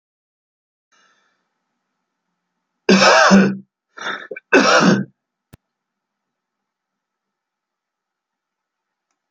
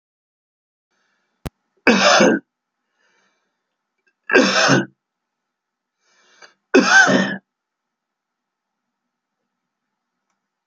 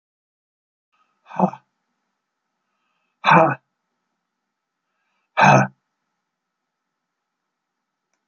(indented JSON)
{
  "cough_length": "9.3 s",
  "cough_amplitude": 32768,
  "cough_signal_mean_std_ratio": 0.3,
  "three_cough_length": "10.7 s",
  "three_cough_amplitude": 32768,
  "three_cough_signal_mean_std_ratio": 0.31,
  "exhalation_length": "8.3 s",
  "exhalation_amplitude": 29273,
  "exhalation_signal_mean_std_ratio": 0.22,
  "survey_phase": "alpha (2021-03-01 to 2021-08-12)",
  "age": "65+",
  "gender": "Male",
  "wearing_mask": "No",
  "symptom_none": true,
  "smoker_status": "Never smoked",
  "respiratory_condition_asthma": false,
  "respiratory_condition_other": false,
  "recruitment_source": "REACT",
  "submission_delay": "2 days",
  "covid_test_result": "Negative",
  "covid_test_method": "RT-qPCR"
}